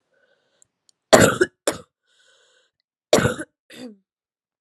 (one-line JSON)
{"cough_length": "4.6 s", "cough_amplitude": 32768, "cough_signal_mean_std_ratio": 0.25, "survey_phase": "beta (2021-08-13 to 2022-03-07)", "age": "18-44", "gender": "Female", "wearing_mask": "No", "symptom_cough_any": true, "symptom_runny_or_blocked_nose": true, "symptom_headache": true, "symptom_onset": "8 days", "smoker_status": "Never smoked", "respiratory_condition_asthma": false, "respiratory_condition_other": false, "recruitment_source": "Test and Trace", "submission_delay": "2 days", "covid_test_result": "Positive", "covid_test_method": "RT-qPCR"}